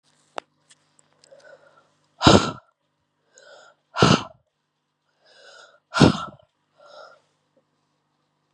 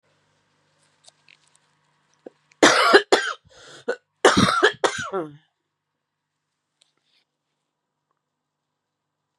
{"exhalation_length": "8.5 s", "exhalation_amplitude": 32767, "exhalation_signal_mean_std_ratio": 0.22, "cough_length": "9.4 s", "cough_amplitude": 32510, "cough_signal_mean_std_ratio": 0.28, "survey_phase": "beta (2021-08-13 to 2022-03-07)", "age": "18-44", "gender": "Female", "wearing_mask": "No", "symptom_cough_any": true, "symptom_new_continuous_cough": true, "symptom_runny_or_blocked_nose": true, "symptom_shortness_of_breath": true, "symptom_diarrhoea": true, "symptom_fever_high_temperature": true, "symptom_headache": true, "symptom_change_to_sense_of_smell_or_taste": true, "symptom_loss_of_taste": true, "symptom_other": true, "symptom_onset": "5 days", "smoker_status": "Ex-smoker", "respiratory_condition_asthma": false, "respiratory_condition_other": false, "recruitment_source": "Test and Trace", "submission_delay": "1 day", "covid_test_result": "Positive", "covid_test_method": "RT-qPCR"}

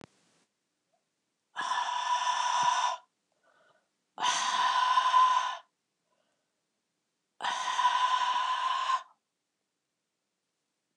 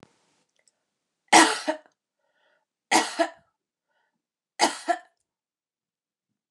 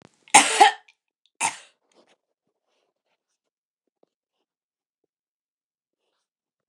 {"exhalation_length": "11.0 s", "exhalation_amplitude": 6249, "exhalation_signal_mean_std_ratio": 0.55, "three_cough_length": "6.5 s", "three_cough_amplitude": 28145, "three_cough_signal_mean_std_ratio": 0.25, "cough_length": "6.7 s", "cough_amplitude": 29204, "cough_signal_mean_std_ratio": 0.18, "survey_phase": "beta (2021-08-13 to 2022-03-07)", "age": "45-64", "gender": "Female", "wearing_mask": "No", "symptom_cough_any": true, "symptom_fatigue": true, "symptom_headache": true, "symptom_change_to_sense_of_smell_or_taste": true, "symptom_loss_of_taste": true, "symptom_onset": "3 days", "smoker_status": "Never smoked", "respiratory_condition_asthma": false, "respiratory_condition_other": false, "recruitment_source": "Test and Trace", "submission_delay": "2 days", "covid_test_result": "Positive", "covid_test_method": "RT-qPCR", "covid_ct_value": 13.8, "covid_ct_gene": "ORF1ab gene"}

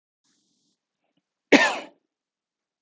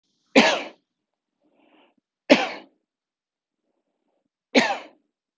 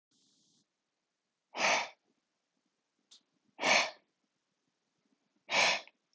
{"cough_length": "2.8 s", "cough_amplitude": 28621, "cough_signal_mean_std_ratio": 0.21, "three_cough_length": "5.4 s", "three_cough_amplitude": 29202, "three_cough_signal_mean_std_ratio": 0.25, "exhalation_length": "6.1 s", "exhalation_amplitude": 7072, "exhalation_signal_mean_std_ratio": 0.3, "survey_phase": "beta (2021-08-13 to 2022-03-07)", "age": "45-64", "gender": "Male", "wearing_mask": "No", "symptom_none": true, "smoker_status": "Ex-smoker", "respiratory_condition_asthma": false, "respiratory_condition_other": false, "recruitment_source": "REACT", "submission_delay": "13 days", "covid_test_result": "Negative", "covid_test_method": "RT-qPCR", "influenza_a_test_result": "Negative", "influenza_b_test_result": "Negative"}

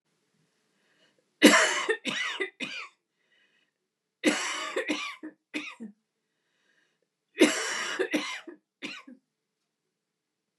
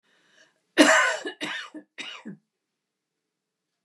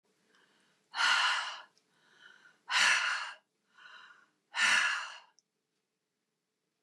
{"three_cough_length": "10.6 s", "three_cough_amplitude": 23062, "three_cough_signal_mean_std_ratio": 0.35, "cough_length": "3.8 s", "cough_amplitude": 28943, "cough_signal_mean_std_ratio": 0.31, "exhalation_length": "6.8 s", "exhalation_amplitude": 6737, "exhalation_signal_mean_std_ratio": 0.41, "survey_phase": "beta (2021-08-13 to 2022-03-07)", "age": "65+", "gender": "Female", "wearing_mask": "No", "symptom_runny_or_blocked_nose": true, "symptom_fatigue": true, "symptom_onset": "12 days", "smoker_status": "Ex-smoker", "respiratory_condition_asthma": false, "respiratory_condition_other": false, "recruitment_source": "REACT", "submission_delay": "1 day", "covid_test_result": "Negative", "covid_test_method": "RT-qPCR"}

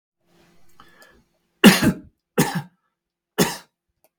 {"three_cough_length": "4.2 s", "three_cough_amplitude": 32768, "three_cough_signal_mean_std_ratio": 0.27, "survey_phase": "beta (2021-08-13 to 2022-03-07)", "age": "65+", "gender": "Male", "wearing_mask": "No", "symptom_none": true, "smoker_status": "Never smoked", "respiratory_condition_asthma": false, "respiratory_condition_other": false, "recruitment_source": "REACT", "submission_delay": "2 days", "covid_test_method": "RT-qPCR"}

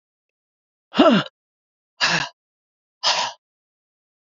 {"exhalation_length": "4.4 s", "exhalation_amplitude": 27457, "exhalation_signal_mean_std_ratio": 0.32, "survey_phase": "beta (2021-08-13 to 2022-03-07)", "age": "45-64", "gender": "Female", "wearing_mask": "No", "symptom_none": true, "symptom_onset": "8 days", "smoker_status": "Ex-smoker", "respiratory_condition_asthma": false, "respiratory_condition_other": false, "recruitment_source": "REACT", "submission_delay": "1 day", "covid_test_result": "Negative", "covid_test_method": "RT-qPCR"}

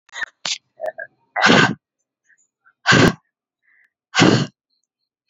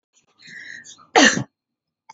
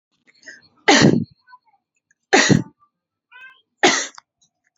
{"exhalation_length": "5.3 s", "exhalation_amplitude": 32767, "exhalation_signal_mean_std_ratio": 0.36, "cough_length": "2.1 s", "cough_amplitude": 32767, "cough_signal_mean_std_ratio": 0.29, "three_cough_length": "4.8 s", "three_cough_amplitude": 28857, "three_cough_signal_mean_std_ratio": 0.33, "survey_phase": "alpha (2021-03-01 to 2021-08-12)", "age": "18-44", "gender": "Female", "wearing_mask": "No", "symptom_headache": true, "symptom_onset": "8 days", "smoker_status": "Never smoked", "respiratory_condition_asthma": false, "respiratory_condition_other": false, "recruitment_source": "REACT", "submission_delay": "2 days", "covid_test_result": "Negative", "covid_test_method": "RT-qPCR"}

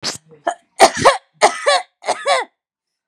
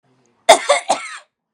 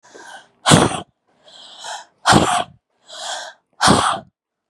{"three_cough_length": "3.1 s", "three_cough_amplitude": 32768, "three_cough_signal_mean_std_ratio": 0.42, "cough_length": "1.5 s", "cough_amplitude": 32768, "cough_signal_mean_std_ratio": 0.35, "exhalation_length": "4.7 s", "exhalation_amplitude": 32768, "exhalation_signal_mean_std_ratio": 0.41, "survey_phase": "beta (2021-08-13 to 2022-03-07)", "age": "18-44", "gender": "Female", "wearing_mask": "Yes", "symptom_none": true, "smoker_status": "Never smoked", "respiratory_condition_asthma": false, "respiratory_condition_other": false, "recruitment_source": "Test and Trace", "submission_delay": "1 day", "covid_test_result": "Negative", "covid_test_method": "RT-qPCR"}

